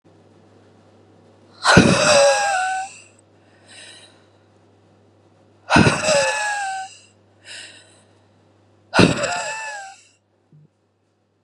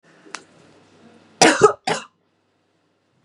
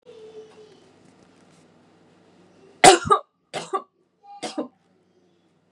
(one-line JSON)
{"exhalation_length": "11.4 s", "exhalation_amplitude": 32768, "exhalation_signal_mean_std_ratio": 0.4, "cough_length": "3.2 s", "cough_amplitude": 32079, "cough_signal_mean_std_ratio": 0.26, "three_cough_length": "5.7 s", "three_cough_amplitude": 32767, "three_cough_signal_mean_std_ratio": 0.21, "survey_phase": "beta (2021-08-13 to 2022-03-07)", "age": "18-44", "gender": "Female", "wearing_mask": "No", "symptom_fatigue": true, "symptom_onset": "11 days", "smoker_status": "Never smoked", "respiratory_condition_asthma": false, "respiratory_condition_other": false, "recruitment_source": "REACT", "submission_delay": "3 days", "covid_test_result": "Negative", "covid_test_method": "RT-qPCR", "influenza_a_test_result": "Negative", "influenza_b_test_result": "Negative"}